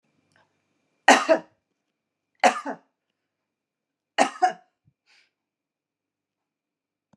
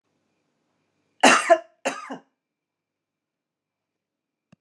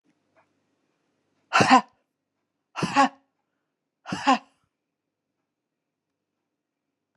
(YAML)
three_cough_length: 7.2 s
three_cough_amplitude: 31500
three_cough_signal_mean_std_ratio: 0.21
cough_length: 4.6 s
cough_amplitude: 29276
cough_signal_mean_std_ratio: 0.22
exhalation_length: 7.2 s
exhalation_amplitude: 25039
exhalation_signal_mean_std_ratio: 0.23
survey_phase: beta (2021-08-13 to 2022-03-07)
age: 65+
gender: Female
wearing_mask: 'No'
symptom_sore_throat: true
symptom_fatigue: true
symptom_headache: true
smoker_status: Never smoked
respiratory_condition_asthma: false
respiratory_condition_other: false
recruitment_source: REACT
submission_delay: 2 days
covid_test_result: Negative
covid_test_method: RT-qPCR